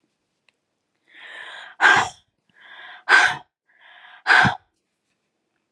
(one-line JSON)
{"exhalation_length": "5.7 s", "exhalation_amplitude": 28261, "exhalation_signal_mean_std_ratio": 0.32, "survey_phase": "alpha (2021-03-01 to 2021-08-12)", "age": "45-64", "gender": "Female", "wearing_mask": "No", "symptom_cough_any": true, "symptom_shortness_of_breath": true, "symptom_fatigue": true, "symptom_headache": true, "symptom_onset": "33 days", "smoker_status": "Never smoked", "respiratory_condition_asthma": true, "respiratory_condition_other": false, "recruitment_source": "Test and Trace", "submission_delay": "2 days", "covid_test_result": "Positive", "covid_test_method": "RT-qPCR"}